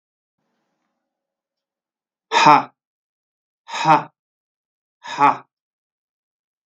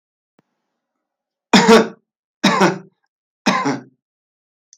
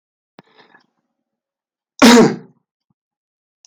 exhalation_length: 6.7 s
exhalation_amplitude: 32768
exhalation_signal_mean_std_ratio: 0.25
three_cough_length: 4.8 s
three_cough_amplitude: 32768
three_cough_signal_mean_std_ratio: 0.34
cough_length: 3.7 s
cough_amplitude: 32768
cough_signal_mean_std_ratio: 0.25
survey_phase: beta (2021-08-13 to 2022-03-07)
age: 45-64
gender: Male
wearing_mask: 'No'
symptom_diarrhoea: true
symptom_fatigue: true
symptom_change_to_sense_of_smell_or_taste: true
symptom_onset: 6 days
smoker_status: Never smoked
respiratory_condition_asthma: false
respiratory_condition_other: false
recruitment_source: Test and Trace
submission_delay: 2 days
covid_test_result: Positive
covid_test_method: RT-qPCR
covid_ct_value: 19.4
covid_ct_gene: ORF1ab gene
covid_ct_mean: 19.9
covid_viral_load: 300000 copies/ml
covid_viral_load_category: Low viral load (10K-1M copies/ml)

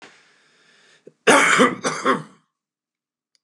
cough_length: 3.4 s
cough_amplitude: 28654
cough_signal_mean_std_ratio: 0.37
survey_phase: beta (2021-08-13 to 2022-03-07)
age: 45-64
gender: Male
wearing_mask: 'No'
symptom_none: true
smoker_status: Current smoker (11 or more cigarettes per day)
respiratory_condition_asthma: false
respiratory_condition_other: false
recruitment_source: REACT
submission_delay: 1 day
covid_test_result: Negative
covid_test_method: RT-qPCR
influenza_a_test_result: Negative
influenza_b_test_result: Negative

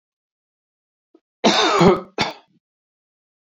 cough_length: 3.4 s
cough_amplitude: 26250
cough_signal_mean_std_ratio: 0.35
survey_phase: beta (2021-08-13 to 2022-03-07)
age: 65+
gender: Male
wearing_mask: 'No'
symptom_cough_any: true
symptom_onset: 12 days
smoker_status: Ex-smoker
respiratory_condition_asthma: false
respiratory_condition_other: false
recruitment_source: REACT
submission_delay: 1 day
covid_test_result: Negative
covid_test_method: RT-qPCR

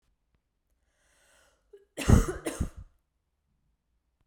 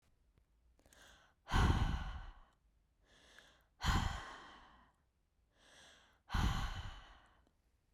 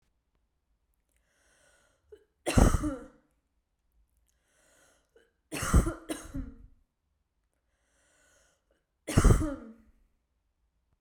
cough_length: 4.3 s
cough_amplitude: 17267
cough_signal_mean_std_ratio: 0.22
exhalation_length: 7.9 s
exhalation_amplitude: 3263
exhalation_signal_mean_std_ratio: 0.38
three_cough_length: 11.0 s
three_cough_amplitude: 18559
three_cough_signal_mean_std_ratio: 0.25
survey_phase: beta (2021-08-13 to 2022-03-07)
age: 18-44
gender: Female
wearing_mask: 'No'
symptom_none: true
smoker_status: Never smoked
respiratory_condition_asthma: false
respiratory_condition_other: false
recruitment_source: REACT
submission_delay: 1 day
covid_test_result: Negative
covid_test_method: RT-qPCR
influenza_a_test_result: Negative
influenza_b_test_result: Negative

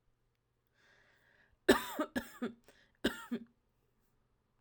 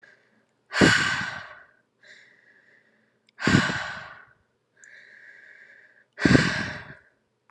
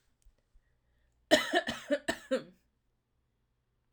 three_cough_length: 4.6 s
three_cough_amplitude: 9322
three_cough_signal_mean_std_ratio: 0.25
exhalation_length: 7.5 s
exhalation_amplitude: 25411
exhalation_signal_mean_std_ratio: 0.35
cough_length: 3.9 s
cough_amplitude: 11615
cough_signal_mean_std_ratio: 0.29
survey_phase: alpha (2021-03-01 to 2021-08-12)
age: 18-44
gender: Female
wearing_mask: 'No'
symptom_none: true
smoker_status: Never smoked
respiratory_condition_asthma: true
respiratory_condition_other: false
recruitment_source: REACT
submission_delay: 1 day
covid_test_result: Negative
covid_test_method: RT-qPCR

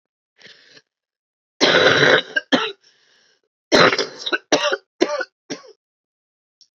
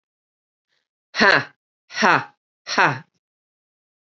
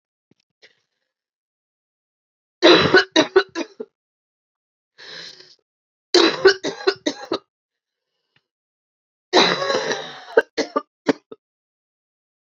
cough_length: 6.7 s
cough_amplitude: 32767
cough_signal_mean_std_ratio: 0.39
exhalation_length: 4.1 s
exhalation_amplitude: 28633
exhalation_signal_mean_std_ratio: 0.3
three_cough_length: 12.5 s
three_cough_amplitude: 30194
three_cough_signal_mean_std_ratio: 0.3
survey_phase: beta (2021-08-13 to 2022-03-07)
age: 45-64
gender: Female
wearing_mask: 'No'
symptom_cough_any: true
symptom_new_continuous_cough: true
symptom_runny_or_blocked_nose: true
symptom_sore_throat: true
symptom_fatigue: true
symptom_headache: true
symptom_change_to_sense_of_smell_or_taste: true
symptom_onset: 2 days
smoker_status: Current smoker (1 to 10 cigarettes per day)
respiratory_condition_asthma: false
respiratory_condition_other: false
recruitment_source: Test and Trace
submission_delay: 1 day
covid_test_result: Positive
covid_test_method: RT-qPCR
covid_ct_value: 23.5
covid_ct_gene: ORF1ab gene
covid_ct_mean: 24.9
covid_viral_load: 7100 copies/ml
covid_viral_load_category: Minimal viral load (< 10K copies/ml)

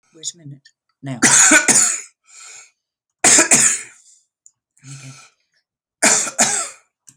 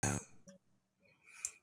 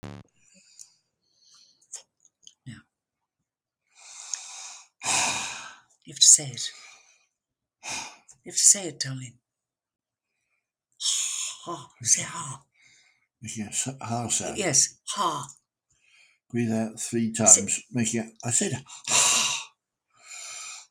three_cough_length: 7.2 s
three_cough_amplitude: 32768
three_cough_signal_mean_std_ratio: 0.42
cough_length: 1.6 s
cough_amplitude: 2734
cough_signal_mean_std_ratio: 0.34
exhalation_length: 20.9 s
exhalation_amplitude: 32767
exhalation_signal_mean_std_ratio: 0.4
survey_phase: alpha (2021-03-01 to 2021-08-12)
age: 65+
gender: Male
wearing_mask: 'No'
symptom_none: true
smoker_status: Never smoked
respiratory_condition_asthma: false
respiratory_condition_other: false
recruitment_source: REACT
submission_delay: 1 day
covid_test_result: Negative
covid_test_method: RT-qPCR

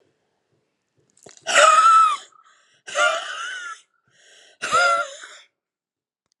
exhalation_length: 6.4 s
exhalation_amplitude: 26843
exhalation_signal_mean_std_ratio: 0.42
survey_phase: alpha (2021-03-01 to 2021-08-12)
age: 45-64
gender: Female
wearing_mask: 'No'
symptom_cough_any: true
symptom_fatigue: true
symptom_fever_high_temperature: true
symptom_headache: true
symptom_change_to_sense_of_smell_or_taste: true
symptom_onset: 3 days
smoker_status: Never smoked
respiratory_condition_asthma: false
respiratory_condition_other: false
recruitment_source: Test and Trace
submission_delay: 2 days
covid_test_result: Positive
covid_test_method: RT-qPCR
covid_ct_value: 21.0
covid_ct_gene: ORF1ab gene
covid_ct_mean: 21.6
covid_viral_load: 81000 copies/ml
covid_viral_load_category: Low viral load (10K-1M copies/ml)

